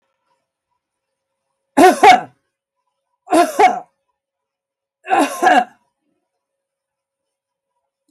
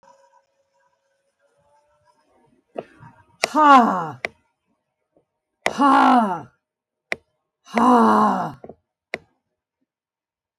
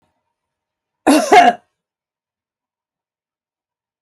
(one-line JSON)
{"three_cough_length": "8.1 s", "three_cough_amplitude": 32768, "three_cough_signal_mean_std_ratio": 0.3, "exhalation_length": "10.6 s", "exhalation_amplitude": 32766, "exhalation_signal_mean_std_ratio": 0.34, "cough_length": "4.0 s", "cough_amplitude": 32768, "cough_signal_mean_std_ratio": 0.26, "survey_phase": "beta (2021-08-13 to 2022-03-07)", "age": "65+", "gender": "Female", "wearing_mask": "No", "symptom_none": true, "smoker_status": "Never smoked", "respiratory_condition_asthma": false, "respiratory_condition_other": false, "recruitment_source": "REACT", "submission_delay": "11 days", "covid_test_result": "Negative", "covid_test_method": "RT-qPCR"}